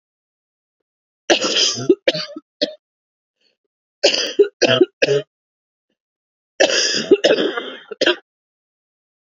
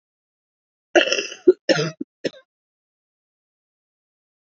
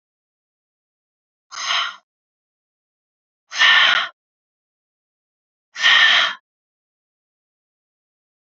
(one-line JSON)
{"three_cough_length": "9.2 s", "three_cough_amplitude": 29663, "three_cough_signal_mean_std_ratio": 0.4, "cough_length": "4.4 s", "cough_amplitude": 31819, "cough_signal_mean_std_ratio": 0.24, "exhalation_length": "8.5 s", "exhalation_amplitude": 26524, "exhalation_signal_mean_std_ratio": 0.31, "survey_phase": "beta (2021-08-13 to 2022-03-07)", "age": "18-44", "gender": "Female", "wearing_mask": "No", "symptom_cough_any": true, "symptom_new_continuous_cough": true, "symptom_runny_or_blocked_nose": true, "symptom_shortness_of_breath": true, "symptom_sore_throat": true, "symptom_fatigue": true, "symptom_fever_high_temperature": true, "symptom_headache": true, "symptom_onset": "3 days", "smoker_status": "Ex-smoker", "respiratory_condition_asthma": false, "respiratory_condition_other": false, "recruitment_source": "Test and Trace", "submission_delay": "1 day", "covid_test_result": "Positive", "covid_test_method": "RT-qPCR", "covid_ct_value": 15.0, "covid_ct_gene": "ORF1ab gene"}